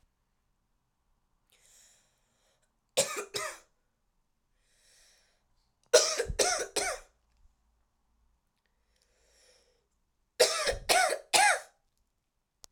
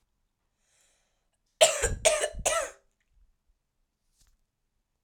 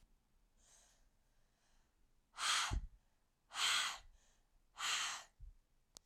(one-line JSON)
{"three_cough_length": "12.7 s", "three_cough_amplitude": 13991, "three_cough_signal_mean_std_ratio": 0.3, "cough_length": "5.0 s", "cough_amplitude": 18739, "cough_signal_mean_std_ratio": 0.29, "exhalation_length": "6.1 s", "exhalation_amplitude": 2136, "exhalation_signal_mean_std_ratio": 0.41, "survey_phase": "alpha (2021-03-01 to 2021-08-12)", "age": "18-44", "gender": "Female", "wearing_mask": "No", "symptom_cough_any": true, "symptom_abdominal_pain": true, "symptom_diarrhoea": true, "symptom_fatigue": true, "symptom_fever_high_temperature": true, "symptom_headache": true, "symptom_onset": "3 days", "smoker_status": "Never smoked", "respiratory_condition_asthma": false, "respiratory_condition_other": false, "recruitment_source": "Test and Trace", "submission_delay": "2 days", "covid_test_result": "Positive", "covid_test_method": "RT-qPCR", "covid_ct_value": 39.8, "covid_ct_gene": "ORF1ab gene"}